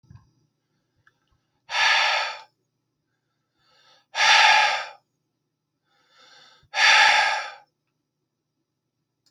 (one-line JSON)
{"exhalation_length": "9.3 s", "exhalation_amplitude": 23199, "exhalation_signal_mean_std_ratio": 0.37, "survey_phase": "beta (2021-08-13 to 2022-03-07)", "age": "18-44", "gender": "Male", "wearing_mask": "No", "symptom_none": true, "smoker_status": "Never smoked", "respiratory_condition_asthma": false, "respiratory_condition_other": false, "recruitment_source": "REACT", "submission_delay": "2 days", "covid_test_result": "Negative", "covid_test_method": "RT-qPCR"}